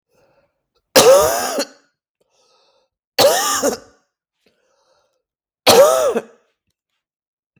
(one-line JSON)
{"three_cough_length": "7.6 s", "three_cough_amplitude": 32768, "three_cough_signal_mean_std_ratio": 0.37, "survey_phase": "beta (2021-08-13 to 2022-03-07)", "age": "18-44", "gender": "Male", "wearing_mask": "No", "symptom_cough_any": true, "symptom_other": true, "symptom_onset": "12 days", "smoker_status": "Never smoked", "respiratory_condition_asthma": false, "respiratory_condition_other": false, "recruitment_source": "REACT", "submission_delay": "2 days", "covid_test_result": "Negative", "covid_test_method": "RT-qPCR", "influenza_a_test_result": "Unknown/Void", "influenza_b_test_result": "Unknown/Void"}